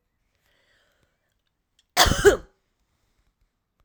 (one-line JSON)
{"cough_length": "3.8 s", "cough_amplitude": 28593, "cough_signal_mean_std_ratio": 0.22, "survey_phase": "alpha (2021-03-01 to 2021-08-12)", "age": "45-64", "gender": "Female", "wearing_mask": "No", "symptom_none": true, "smoker_status": "Never smoked", "respiratory_condition_asthma": false, "respiratory_condition_other": false, "recruitment_source": "REACT", "submission_delay": "2 days", "covid_test_result": "Negative", "covid_test_method": "RT-qPCR"}